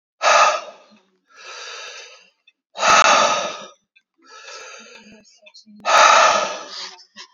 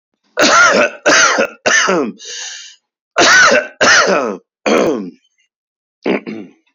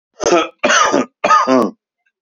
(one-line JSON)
{"exhalation_length": "7.3 s", "exhalation_amplitude": 31518, "exhalation_signal_mean_std_ratio": 0.44, "cough_length": "6.7 s", "cough_amplitude": 31511, "cough_signal_mean_std_ratio": 0.61, "three_cough_length": "2.2 s", "three_cough_amplitude": 29782, "three_cough_signal_mean_std_ratio": 0.62, "survey_phase": "beta (2021-08-13 to 2022-03-07)", "age": "45-64", "gender": "Male", "wearing_mask": "No", "symptom_none": true, "symptom_onset": "12 days", "smoker_status": "Ex-smoker", "respiratory_condition_asthma": false, "respiratory_condition_other": false, "recruitment_source": "REACT", "submission_delay": "-1 day", "covid_test_result": "Negative", "covid_test_method": "RT-qPCR", "influenza_a_test_result": "Unknown/Void", "influenza_b_test_result": "Unknown/Void"}